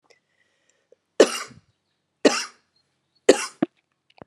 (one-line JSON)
{"three_cough_length": "4.3 s", "three_cough_amplitude": 32742, "three_cough_signal_mean_std_ratio": 0.21, "survey_phase": "alpha (2021-03-01 to 2021-08-12)", "age": "45-64", "gender": "Female", "wearing_mask": "No", "symptom_change_to_sense_of_smell_or_taste": true, "symptom_onset": "4 days", "smoker_status": "Never smoked", "respiratory_condition_asthma": false, "respiratory_condition_other": false, "recruitment_source": "Test and Trace", "submission_delay": "1 day", "covid_test_result": "Positive", "covid_test_method": "RT-qPCR", "covid_ct_value": 13.6, "covid_ct_gene": "ORF1ab gene", "covid_ct_mean": 14.0, "covid_viral_load": "25000000 copies/ml", "covid_viral_load_category": "High viral load (>1M copies/ml)"}